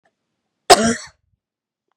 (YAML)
cough_length: 2.0 s
cough_amplitude: 32768
cough_signal_mean_std_ratio: 0.25
survey_phase: beta (2021-08-13 to 2022-03-07)
age: 18-44
gender: Female
wearing_mask: 'No'
symptom_none: true
smoker_status: Never smoked
respiratory_condition_asthma: false
respiratory_condition_other: false
recruitment_source: REACT
submission_delay: 4 days
covid_test_result: Negative
covid_test_method: RT-qPCR
influenza_a_test_result: Negative
influenza_b_test_result: Negative